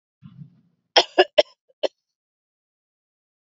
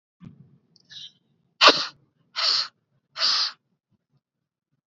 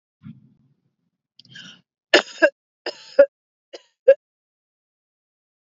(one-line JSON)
{"cough_length": "3.5 s", "cough_amplitude": 31252, "cough_signal_mean_std_ratio": 0.18, "exhalation_length": "4.9 s", "exhalation_amplitude": 30771, "exhalation_signal_mean_std_ratio": 0.3, "three_cough_length": "5.7 s", "three_cough_amplitude": 31422, "three_cough_signal_mean_std_ratio": 0.19, "survey_phase": "beta (2021-08-13 to 2022-03-07)", "age": "18-44", "gender": "Female", "wearing_mask": "No", "symptom_fatigue": true, "symptom_headache": true, "smoker_status": "Ex-smoker", "respiratory_condition_asthma": false, "respiratory_condition_other": false, "recruitment_source": "REACT", "submission_delay": "2 days", "covid_test_result": "Negative", "covid_test_method": "RT-qPCR", "influenza_a_test_result": "Negative", "influenza_b_test_result": "Negative"}